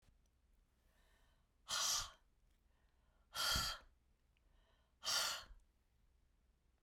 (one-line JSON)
{"exhalation_length": "6.8 s", "exhalation_amplitude": 1698, "exhalation_signal_mean_std_ratio": 0.37, "survey_phase": "beta (2021-08-13 to 2022-03-07)", "age": "45-64", "gender": "Female", "wearing_mask": "No", "symptom_none": true, "smoker_status": "Never smoked", "respiratory_condition_asthma": false, "respiratory_condition_other": false, "recruitment_source": "REACT", "submission_delay": "2 days", "covid_test_result": "Negative", "covid_test_method": "RT-qPCR"}